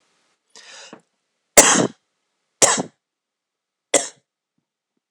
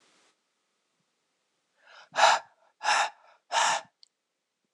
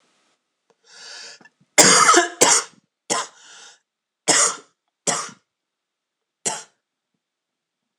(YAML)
three_cough_length: 5.1 s
three_cough_amplitude: 26028
three_cough_signal_mean_std_ratio: 0.25
exhalation_length: 4.7 s
exhalation_amplitude: 14376
exhalation_signal_mean_std_ratio: 0.32
cough_length: 8.0 s
cough_amplitude: 26028
cough_signal_mean_std_ratio: 0.32
survey_phase: beta (2021-08-13 to 2022-03-07)
age: 18-44
gender: Male
wearing_mask: 'No'
symptom_cough_any: true
symptom_new_continuous_cough: true
symptom_fatigue: true
symptom_fever_high_temperature: true
symptom_headache: true
symptom_onset: 5 days
smoker_status: Never smoked
respiratory_condition_asthma: false
respiratory_condition_other: false
recruitment_source: Test and Trace
submission_delay: 2 days
covid_test_result: Positive
covid_test_method: RT-qPCR
covid_ct_value: 20.5
covid_ct_gene: N gene
covid_ct_mean: 21.1
covid_viral_load: 120000 copies/ml
covid_viral_load_category: Low viral load (10K-1M copies/ml)